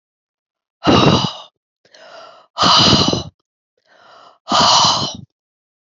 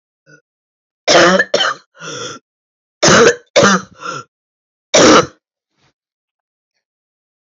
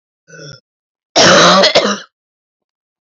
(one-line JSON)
{"exhalation_length": "5.9 s", "exhalation_amplitude": 32331, "exhalation_signal_mean_std_ratio": 0.46, "three_cough_length": "7.5 s", "three_cough_amplitude": 32006, "three_cough_signal_mean_std_ratio": 0.39, "cough_length": "3.1 s", "cough_amplitude": 32730, "cough_signal_mean_std_ratio": 0.46, "survey_phase": "alpha (2021-03-01 to 2021-08-12)", "age": "18-44", "gender": "Female", "wearing_mask": "No", "symptom_cough_any": true, "symptom_fatigue": true, "symptom_headache": true, "symptom_loss_of_taste": true, "smoker_status": "Never smoked", "respiratory_condition_asthma": false, "respiratory_condition_other": false, "recruitment_source": "Test and Trace", "submission_delay": "2 days", "covid_test_result": "Positive", "covid_test_method": "RT-qPCR", "covid_ct_value": 18.8, "covid_ct_gene": "ORF1ab gene", "covid_ct_mean": 19.8, "covid_viral_load": "320000 copies/ml", "covid_viral_load_category": "Low viral load (10K-1M copies/ml)"}